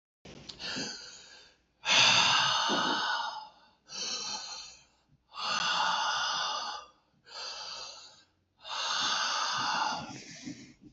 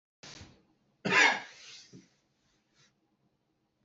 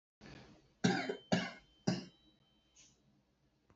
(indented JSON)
{
  "exhalation_length": "10.9 s",
  "exhalation_amplitude": 11066,
  "exhalation_signal_mean_std_ratio": 0.63,
  "cough_length": "3.8 s",
  "cough_amplitude": 9838,
  "cough_signal_mean_std_ratio": 0.25,
  "three_cough_length": "3.8 s",
  "three_cough_amplitude": 4832,
  "three_cough_signal_mean_std_ratio": 0.34,
  "survey_phase": "beta (2021-08-13 to 2022-03-07)",
  "age": "18-44",
  "gender": "Male",
  "wearing_mask": "No",
  "symptom_none": true,
  "smoker_status": "Never smoked",
  "respiratory_condition_asthma": false,
  "respiratory_condition_other": false,
  "recruitment_source": "REACT",
  "submission_delay": "2 days",
  "covid_test_result": "Negative",
  "covid_test_method": "RT-qPCR"
}